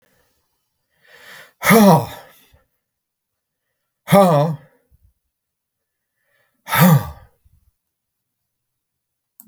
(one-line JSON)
{"exhalation_length": "9.5 s", "exhalation_amplitude": 31326, "exhalation_signal_mean_std_ratio": 0.29, "survey_phase": "beta (2021-08-13 to 2022-03-07)", "age": "65+", "gender": "Male", "wearing_mask": "No", "symptom_none": true, "symptom_onset": "12 days", "smoker_status": "Ex-smoker", "respiratory_condition_asthma": false, "respiratory_condition_other": false, "recruitment_source": "REACT", "submission_delay": "1 day", "covid_test_result": "Negative", "covid_test_method": "RT-qPCR"}